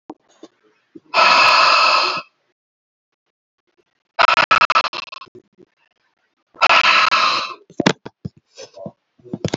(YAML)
exhalation_length: 9.6 s
exhalation_amplitude: 32070
exhalation_signal_mean_std_ratio: 0.43
survey_phase: beta (2021-08-13 to 2022-03-07)
age: 45-64
gender: Female
wearing_mask: 'No'
symptom_none: true
smoker_status: Ex-smoker
respiratory_condition_asthma: false
respiratory_condition_other: false
recruitment_source: REACT
submission_delay: 12 days
covid_test_result: Negative
covid_test_method: RT-qPCR
influenza_a_test_result: Negative
influenza_b_test_result: Negative